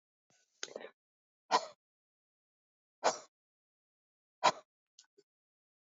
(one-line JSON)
{"exhalation_length": "5.9 s", "exhalation_amplitude": 6251, "exhalation_signal_mean_std_ratio": 0.18, "survey_phase": "alpha (2021-03-01 to 2021-08-12)", "age": "45-64", "gender": "Male", "wearing_mask": "Yes", "symptom_cough_any": true, "symptom_fatigue": true, "symptom_fever_high_temperature": true, "symptom_headache": true, "symptom_change_to_sense_of_smell_or_taste": true, "symptom_onset": "4 days", "smoker_status": "Current smoker (e-cigarettes or vapes only)", "respiratory_condition_asthma": false, "respiratory_condition_other": false, "recruitment_source": "Test and Trace", "submission_delay": "2 days", "covid_test_result": "Positive", "covid_test_method": "RT-qPCR", "covid_ct_value": 17.2, "covid_ct_gene": "ORF1ab gene", "covid_ct_mean": 17.2, "covid_viral_load": "2400000 copies/ml", "covid_viral_load_category": "High viral load (>1M copies/ml)"}